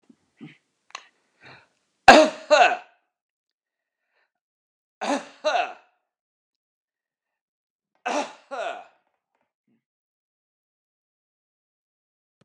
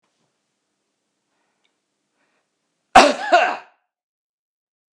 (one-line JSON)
{"three_cough_length": "12.4 s", "three_cough_amplitude": 32768, "three_cough_signal_mean_std_ratio": 0.2, "cough_length": "4.9 s", "cough_amplitude": 32768, "cough_signal_mean_std_ratio": 0.22, "survey_phase": "beta (2021-08-13 to 2022-03-07)", "age": "65+", "gender": "Male", "wearing_mask": "No", "symptom_none": true, "smoker_status": "Ex-smoker", "respiratory_condition_asthma": false, "respiratory_condition_other": false, "recruitment_source": "REACT", "submission_delay": "2 days", "covid_test_result": "Negative", "covid_test_method": "RT-qPCR", "influenza_a_test_result": "Negative", "influenza_b_test_result": "Negative"}